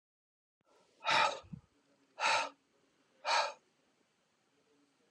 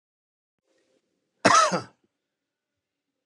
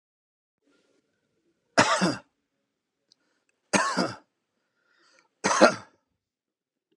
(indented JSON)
{
  "exhalation_length": "5.1 s",
  "exhalation_amplitude": 5082,
  "exhalation_signal_mean_std_ratio": 0.34,
  "cough_length": "3.3 s",
  "cough_amplitude": 24661,
  "cough_signal_mean_std_ratio": 0.25,
  "three_cough_length": "7.0 s",
  "three_cough_amplitude": 32756,
  "three_cough_signal_mean_std_ratio": 0.27,
  "survey_phase": "alpha (2021-03-01 to 2021-08-12)",
  "age": "45-64",
  "gender": "Male",
  "wearing_mask": "No",
  "symptom_none": true,
  "smoker_status": "Ex-smoker",
  "respiratory_condition_asthma": false,
  "respiratory_condition_other": false,
  "recruitment_source": "REACT",
  "submission_delay": "2 days",
  "covid_test_result": "Negative",
  "covid_test_method": "RT-qPCR"
}